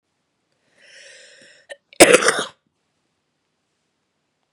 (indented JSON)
{
  "cough_length": "4.5 s",
  "cough_amplitude": 32768,
  "cough_signal_mean_std_ratio": 0.21,
  "survey_phase": "beta (2021-08-13 to 2022-03-07)",
  "age": "18-44",
  "gender": "Female",
  "wearing_mask": "No",
  "symptom_runny_or_blocked_nose": true,
  "symptom_fatigue": true,
  "symptom_change_to_sense_of_smell_or_taste": true,
  "symptom_onset": "5 days",
  "smoker_status": "Never smoked",
  "respiratory_condition_asthma": true,
  "respiratory_condition_other": false,
  "recruitment_source": "Test and Trace",
  "submission_delay": "2 days",
  "covid_test_result": "Positive",
  "covid_test_method": "RT-qPCR",
  "covid_ct_value": 16.4,
  "covid_ct_gene": "S gene",
  "covid_ct_mean": 18.8,
  "covid_viral_load": "660000 copies/ml",
  "covid_viral_load_category": "Low viral load (10K-1M copies/ml)"
}